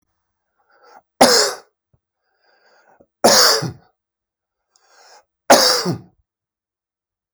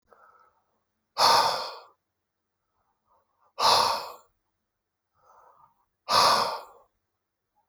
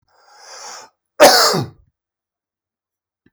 {"three_cough_length": "7.3 s", "three_cough_amplitude": 32768, "three_cough_signal_mean_std_ratio": 0.31, "exhalation_length": "7.7 s", "exhalation_amplitude": 13459, "exhalation_signal_mean_std_ratio": 0.34, "cough_length": "3.3 s", "cough_amplitude": 32768, "cough_signal_mean_std_ratio": 0.3, "survey_phase": "alpha (2021-03-01 to 2021-08-12)", "age": "45-64", "gender": "Male", "wearing_mask": "No", "symptom_none": true, "smoker_status": "Ex-smoker", "respiratory_condition_asthma": false, "respiratory_condition_other": false, "recruitment_source": "REACT", "submission_delay": "2 days", "covid_test_result": "Negative", "covid_test_method": "RT-qPCR"}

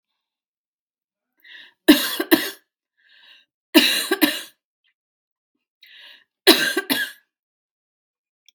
{"three_cough_length": "8.5 s", "three_cough_amplitude": 32768, "three_cough_signal_mean_std_ratio": 0.28, "survey_phase": "beta (2021-08-13 to 2022-03-07)", "age": "45-64", "gender": "Female", "wearing_mask": "No", "symptom_cough_any": true, "symptom_change_to_sense_of_smell_or_taste": true, "symptom_onset": "11 days", "smoker_status": "Ex-smoker", "respiratory_condition_asthma": false, "respiratory_condition_other": false, "recruitment_source": "REACT", "submission_delay": "2 days", "covid_test_result": "Positive", "covid_test_method": "RT-qPCR", "covid_ct_value": 24.0, "covid_ct_gene": "E gene", "influenza_a_test_result": "Negative", "influenza_b_test_result": "Negative"}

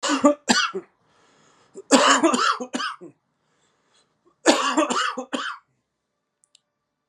{"three_cough_length": "7.1 s", "three_cough_amplitude": 32613, "three_cough_signal_mean_std_ratio": 0.43, "survey_phase": "beta (2021-08-13 to 2022-03-07)", "age": "45-64", "gender": "Male", "wearing_mask": "No", "symptom_cough_any": true, "symptom_runny_or_blocked_nose": true, "symptom_sore_throat": true, "symptom_onset": "7 days", "smoker_status": "Ex-smoker", "respiratory_condition_asthma": false, "respiratory_condition_other": false, "recruitment_source": "REACT", "submission_delay": "2 days", "covid_test_result": "Negative", "covid_test_method": "RT-qPCR"}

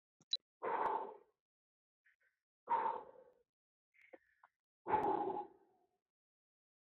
{"exhalation_length": "6.8 s", "exhalation_amplitude": 2160, "exhalation_signal_mean_std_ratio": 0.37, "survey_phase": "beta (2021-08-13 to 2022-03-07)", "age": "18-44", "gender": "Male", "wearing_mask": "No", "symptom_none": true, "smoker_status": "Never smoked", "respiratory_condition_asthma": false, "respiratory_condition_other": false, "recruitment_source": "REACT", "submission_delay": "3 days", "covid_test_result": "Negative", "covid_test_method": "RT-qPCR"}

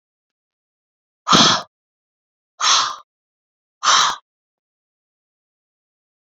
{"exhalation_length": "6.2 s", "exhalation_amplitude": 31552, "exhalation_signal_mean_std_ratio": 0.3, "survey_phase": "beta (2021-08-13 to 2022-03-07)", "age": "45-64", "gender": "Female", "wearing_mask": "No", "symptom_cough_any": true, "symptom_runny_or_blocked_nose": true, "symptom_shortness_of_breath": true, "symptom_diarrhoea": true, "symptom_headache": true, "symptom_onset": "3 days", "smoker_status": "Current smoker (1 to 10 cigarettes per day)", "respiratory_condition_asthma": false, "respiratory_condition_other": false, "recruitment_source": "Test and Trace", "submission_delay": "2 days", "covid_test_result": "Positive", "covid_test_method": "RT-qPCR"}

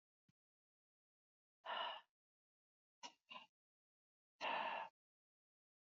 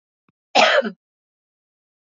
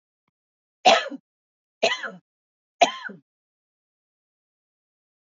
{"exhalation_length": "5.9 s", "exhalation_amplitude": 749, "exhalation_signal_mean_std_ratio": 0.32, "cough_length": "2.0 s", "cough_amplitude": 29897, "cough_signal_mean_std_ratio": 0.31, "three_cough_length": "5.4 s", "three_cough_amplitude": 24758, "three_cough_signal_mean_std_ratio": 0.22, "survey_phase": "beta (2021-08-13 to 2022-03-07)", "age": "45-64", "gender": "Female", "wearing_mask": "No", "symptom_none": true, "smoker_status": "Ex-smoker", "respiratory_condition_asthma": false, "respiratory_condition_other": false, "recruitment_source": "REACT", "submission_delay": "2 days", "covid_test_result": "Negative", "covid_test_method": "RT-qPCR", "influenza_a_test_result": "Negative", "influenza_b_test_result": "Negative"}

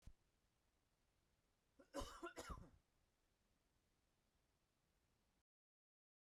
{"cough_length": "6.4 s", "cough_amplitude": 446, "cough_signal_mean_std_ratio": 0.29, "survey_phase": "beta (2021-08-13 to 2022-03-07)", "age": "18-44", "gender": "Male", "wearing_mask": "No", "symptom_cough_any": true, "symptom_shortness_of_breath": true, "symptom_diarrhoea": true, "symptom_fatigue": true, "symptom_headache": true, "smoker_status": "Never smoked", "respiratory_condition_asthma": false, "respiratory_condition_other": false, "recruitment_source": "REACT", "submission_delay": "1 day", "covid_test_result": "Negative", "covid_test_method": "RT-qPCR"}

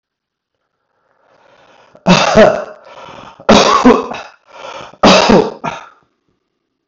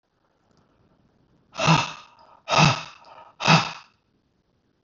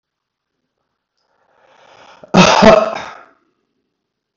{"three_cough_length": "6.9 s", "three_cough_amplitude": 32768, "three_cough_signal_mean_std_ratio": 0.42, "exhalation_length": "4.8 s", "exhalation_amplitude": 22524, "exhalation_signal_mean_std_ratio": 0.33, "cough_length": "4.4 s", "cough_amplitude": 32768, "cough_signal_mean_std_ratio": 0.3, "survey_phase": "beta (2021-08-13 to 2022-03-07)", "age": "45-64", "gender": "Male", "wearing_mask": "No", "symptom_none": true, "smoker_status": "Never smoked", "respiratory_condition_asthma": false, "respiratory_condition_other": false, "recruitment_source": "REACT", "submission_delay": "1 day", "covid_test_result": "Negative", "covid_test_method": "RT-qPCR"}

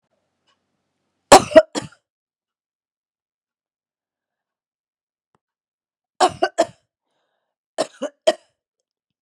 {"three_cough_length": "9.2 s", "three_cough_amplitude": 32768, "three_cough_signal_mean_std_ratio": 0.17, "survey_phase": "beta (2021-08-13 to 2022-03-07)", "age": "45-64", "gender": "Female", "wearing_mask": "No", "symptom_cough_any": true, "symptom_runny_or_blocked_nose": true, "symptom_sore_throat": true, "symptom_headache": true, "symptom_other": true, "symptom_onset": "4 days", "smoker_status": "Never smoked", "respiratory_condition_asthma": false, "respiratory_condition_other": false, "recruitment_source": "Test and Trace", "submission_delay": "2 days", "covid_test_result": "Positive", "covid_test_method": "RT-qPCR", "covid_ct_value": 27.8, "covid_ct_gene": "ORF1ab gene", "covid_ct_mean": 28.2, "covid_viral_load": "560 copies/ml", "covid_viral_load_category": "Minimal viral load (< 10K copies/ml)"}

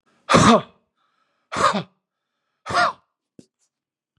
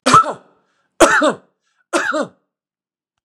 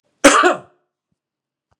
{"exhalation_length": "4.2 s", "exhalation_amplitude": 31940, "exhalation_signal_mean_std_ratio": 0.33, "three_cough_length": "3.2 s", "three_cough_amplitude": 32768, "three_cough_signal_mean_std_ratio": 0.39, "cough_length": "1.8 s", "cough_amplitude": 32768, "cough_signal_mean_std_ratio": 0.32, "survey_phase": "beta (2021-08-13 to 2022-03-07)", "age": "65+", "gender": "Male", "wearing_mask": "No", "symptom_none": true, "smoker_status": "Never smoked", "respiratory_condition_asthma": false, "respiratory_condition_other": false, "recruitment_source": "REACT", "submission_delay": "1 day", "covid_test_result": "Negative", "covid_test_method": "RT-qPCR", "influenza_a_test_result": "Negative", "influenza_b_test_result": "Negative"}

